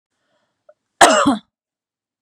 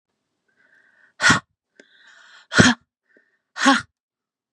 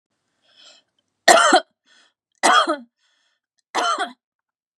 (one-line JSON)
{"cough_length": "2.2 s", "cough_amplitude": 32768, "cough_signal_mean_std_ratio": 0.31, "exhalation_length": "4.5 s", "exhalation_amplitude": 32768, "exhalation_signal_mean_std_ratio": 0.28, "three_cough_length": "4.8 s", "three_cough_amplitude": 32768, "three_cough_signal_mean_std_ratio": 0.34, "survey_phase": "beta (2021-08-13 to 2022-03-07)", "age": "45-64", "gender": "Female", "wearing_mask": "No", "symptom_none": true, "smoker_status": "Never smoked", "respiratory_condition_asthma": false, "respiratory_condition_other": false, "recruitment_source": "REACT", "submission_delay": "4 days", "covid_test_result": "Negative", "covid_test_method": "RT-qPCR", "influenza_a_test_result": "Negative", "influenza_b_test_result": "Negative"}